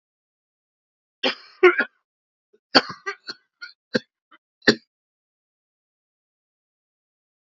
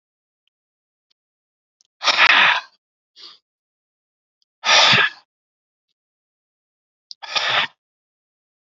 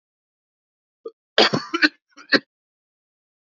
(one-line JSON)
{"three_cough_length": "7.5 s", "three_cough_amplitude": 30913, "three_cough_signal_mean_std_ratio": 0.19, "exhalation_length": "8.6 s", "exhalation_amplitude": 29397, "exhalation_signal_mean_std_ratio": 0.31, "cough_length": "3.4 s", "cough_amplitude": 29845, "cough_signal_mean_std_ratio": 0.25, "survey_phase": "alpha (2021-03-01 to 2021-08-12)", "age": "45-64", "gender": "Male", "wearing_mask": "No", "symptom_cough_any": true, "symptom_onset": "2 days", "smoker_status": "Current smoker (11 or more cigarettes per day)", "respiratory_condition_asthma": false, "respiratory_condition_other": false, "recruitment_source": "Test and Trace", "submission_delay": "2 days", "covid_test_result": "Positive", "covid_test_method": "RT-qPCR", "covid_ct_value": 18.2, "covid_ct_gene": "ORF1ab gene"}